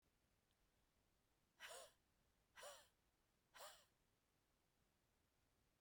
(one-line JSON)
{"exhalation_length": "5.8 s", "exhalation_amplitude": 152, "exhalation_signal_mean_std_ratio": 0.41, "survey_phase": "beta (2021-08-13 to 2022-03-07)", "age": "45-64", "gender": "Female", "wearing_mask": "No", "symptom_none": true, "smoker_status": "Never smoked", "respiratory_condition_asthma": false, "respiratory_condition_other": false, "recruitment_source": "REACT", "submission_delay": "1 day", "covid_test_result": "Negative", "covid_test_method": "RT-qPCR"}